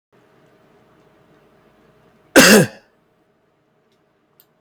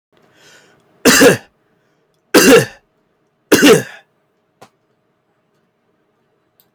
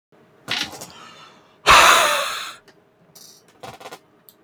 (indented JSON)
{
  "cough_length": "4.6 s",
  "cough_amplitude": 32768,
  "cough_signal_mean_std_ratio": 0.22,
  "three_cough_length": "6.7 s",
  "three_cough_amplitude": 32768,
  "three_cough_signal_mean_std_ratio": 0.32,
  "exhalation_length": "4.4 s",
  "exhalation_amplitude": 32767,
  "exhalation_signal_mean_std_ratio": 0.35,
  "survey_phase": "alpha (2021-03-01 to 2021-08-12)",
  "age": "45-64",
  "gender": "Male",
  "wearing_mask": "No",
  "symptom_none": true,
  "smoker_status": "Never smoked",
  "respiratory_condition_asthma": false,
  "respiratory_condition_other": false,
  "recruitment_source": "REACT",
  "submission_delay": "2 days",
  "covid_test_result": "Negative",
  "covid_test_method": "RT-qPCR"
}